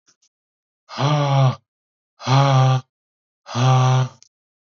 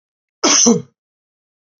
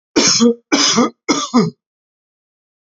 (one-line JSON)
{"exhalation_length": "4.6 s", "exhalation_amplitude": 21512, "exhalation_signal_mean_std_ratio": 0.57, "cough_length": "1.8 s", "cough_amplitude": 32768, "cough_signal_mean_std_ratio": 0.37, "three_cough_length": "2.9 s", "three_cough_amplitude": 32745, "three_cough_signal_mean_std_ratio": 0.52, "survey_phase": "alpha (2021-03-01 to 2021-08-12)", "age": "45-64", "gender": "Male", "wearing_mask": "No", "symptom_none": true, "smoker_status": "Ex-smoker", "respiratory_condition_asthma": false, "respiratory_condition_other": false, "recruitment_source": "REACT", "submission_delay": "1 day", "covid_test_result": "Negative", "covid_test_method": "RT-qPCR"}